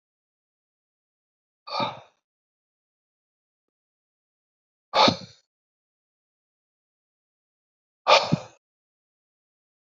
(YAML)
exhalation_length: 9.8 s
exhalation_amplitude: 23940
exhalation_signal_mean_std_ratio: 0.18
survey_phase: beta (2021-08-13 to 2022-03-07)
age: 65+
gender: Male
wearing_mask: 'No'
symptom_none: true
smoker_status: Ex-smoker
respiratory_condition_asthma: false
respiratory_condition_other: false
recruitment_source: REACT
submission_delay: 1 day
covid_test_result: Negative
covid_test_method: RT-qPCR
influenza_a_test_result: Negative
influenza_b_test_result: Negative